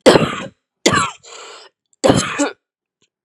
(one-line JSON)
{"three_cough_length": "3.2 s", "three_cough_amplitude": 32768, "three_cough_signal_mean_std_ratio": 0.41, "survey_phase": "beta (2021-08-13 to 2022-03-07)", "age": "18-44", "gender": "Female", "wearing_mask": "No", "symptom_cough_any": true, "symptom_new_continuous_cough": true, "symptom_runny_or_blocked_nose": true, "symptom_diarrhoea": true, "symptom_fatigue": true, "symptom_change_to_sense_of_smell_or_taste": true, "symptom_loss_of_taste": true, "symptom_onset": "5 days", "smoker_status": "Ex-smoker", "respiratory_condition_asthma": false, "respiratory_condition_other": true, "recruitment_source": "Test and Trace", "submission_delay": "2 days", "covid_test_result": "Positive", "covid_test_method": "RT-qPCR", "covid_ct_value": 15.5, "covid_ct_gene": "ORF1ab gene", "covid_ct_mean": 15.7, "covid_viral_load": "7000000 copies/ml", "covid_viral_load_category": "High viral load (>1M copies/ml)"}